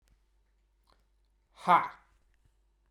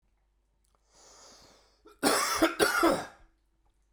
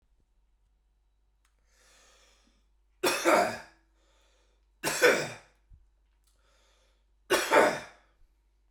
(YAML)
exhalation_length: 2.9 s
exhalation_amplitude: 10693
exhalation_signal_mean_std_ratio: 0.2
cough_length: 3.9 s
cough_amplitude: 9400
cough_signal_mean_std_ratio: 0.4
three_cough_length: 8.7 s
three_cough_amplitude: 14288
three_cough_signal_mean_std_ratio: 0.31
survey_phase: beta (2021-08-13 to 2022-03-07)
age: 45-64
gender: Male
wearing_mask: 'No'
symptom_cough_any: true
symptom_fatigue: true
smoker_status: Prefer not to say
respiratory_condition_asthma: false
respiratory_condition_other: false
recruitment_source: Test and Trace
submission_delay: 1 day
covid_test_result: Positive
covid_test_method: RT-qPCR